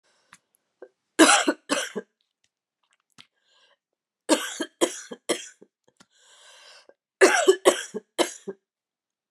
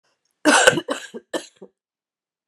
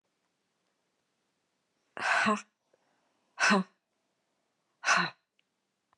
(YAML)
three_cough_length: 9.3 s
three_cough_amplitude: 28603
three_cough_signal_mean_std_ratio: 0.29
cough_length: 2.5 s
cough_amplitude: 32768
cough_signal_mean_std_ratio: 0.32
exhalation_length: 6.0 s
exhalation_amplitude: 9849
exhalation_signal_mean_std_ratio: 0.3
survey_phase: beta (2021-08-13 to 2022-03-07)
age: 45-64
gender: Female
wearing_mask: 'No'
symptom_cough_any: true
symptom_runny_or_blocked_nose: true
symptom_fatigue: true
symptom_headache: true
symptom_change_to_sense_of_smell_or_taste: true
symptom_loss_of_taste: true
symptom_onset: 4 days
smoker_status: Ex-smoker
respiratory_condition_asthma: false
respiratory_condition_other: false
recruitment_source: Test and Trace
submission_delay: 2 days
covid_test_result: Positive
covid_test_method: RT-qPCR
covid_ct_value: 13.5
covid_ct_gene: ORF1ab gene
covid_ct_mean: 13.8
covid_viral_load: 30000000 copies/ml
covid_viral_load_category: High viral load (>1M copies/ml)